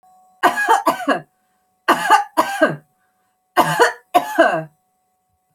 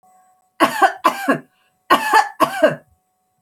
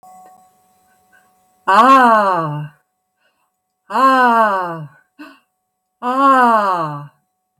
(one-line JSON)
{"three_cough_length": "5.5 s", "three_cough_amplitude": 31134, "three_cough_signal_mean_std_ratio": 0.47, "cough_length": "3.4 s", "cough_amplitude": 32767, "cough_signal_mean_std_ratio": 0.44, "exhalation_length": "7.6 s", "exhalation_amplitude": 31085, "exhalation_signal_mean_std_ratio": 0.5, "survey_phase": "alpha (2021-03-01 to 2021-08-12)", "age": "45-64", "gender": "Female", "wearing_mask": "No", "symptom_none": true, "smoker_status": "Ex-smoker", "respiratory_condition_asthma": false, "respiratory_condition_other": false, "recruitment_source": "REACT", "submission_delay": "7 days", "covid_test_result": "Negative", "covid_test_method": "RT-qPCR"}